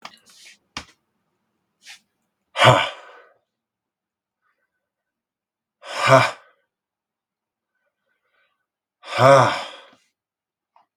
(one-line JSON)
{"exhalation_length": "11.0 s", "exhalation_amplitude": 32767, "exhalation_signal_mean_std_ratio": 0.24, "survey_phase": "beta (2021-08-13 to 2022-03-07)", "age": "18-44", "gender": "Male", "wearing_mask": "No", "symptom_cough_any": true, "symptom_runny_or_blocked_nose": true, "symptom_fatigue": true, "symptom_change_to_sense_of_smell_or_taste": true, "symptom_onset": "2 days", "smoker_status": "Never smoked", "respiratory_condition_asthma": false, "respiratory_condition_other": false, "recruitment_source": "Test and Trace", "submission_delay": "1 day", "covid_test_result": "Positive", "covid_test_method": "RT-qPCR", "covid_ct_value": 13.4, "covid_ct_gene": "ORF1ab gene", "covid_ct_mean": 13.9, "covid_viral_load": "28000000 copies/ml", "covid_viral_load_category": "High viral load (>1M copies/ml)"}